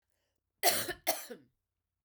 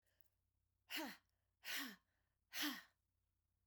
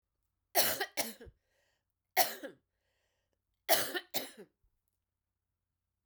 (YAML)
cough_length: 2.0 s
cough_amplitude: 7784
cough_signal_mean_std_ratio: 0.34
exhalation_length: 3.7 s
exhalation_amplitude: 1111
exhalation_signal_mean_std_ratio: 0.38
three_cough_length: 6.1 s
three_cough_amplitude: 7986
three_cough_signal_mean_std_ratio: 0.29
survey_phase: beta (2021-08-13 to 2022-03-07)
age: 45-64
gender: Female
wearing_mask: 'No'
symptom_new_continuous_cough: true
symptom_runny_or_blocked_nose: true
symptom_fatigue: true
symptom_headache: true
symptom_onset: 2 days
smoker_status: Never smoked
respiratory_condition_asthma: false
respiratory_condition_other: false
recruitment_source: Test and Trace
submission_delay: 2 days
covid_test_result: Positive
covid_test_method: RT-qPCR
covid_ct_value: 24.9
covid_ct_gene: N gene